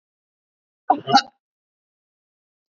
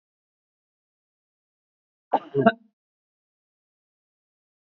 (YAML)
cough_length: 2.7 s
cough_amplitude: 24749
cough_signal_mean_std_ratio: 0.2
three_cough_length: 4.7 s
three_cough_amplitude: 23456
three_cough_signal_mean_std_ratio: 0.15
survey_phase: beta (2021-08-13 to 2022-03-07)
age: 45-64
gender: Female
wearing_mask: 'No'
symptom_none: true
smoker_status: Ex-smoker
respiratory_condition_asthma: false
respiratory_condition_other: false
recruitment_source: REACT
submission_delay: 3 days
covid_test_result: Negative
covid_test_method: RT-qPCR
influenza_a_test_result: Negative
influenza_b_test_result: Negative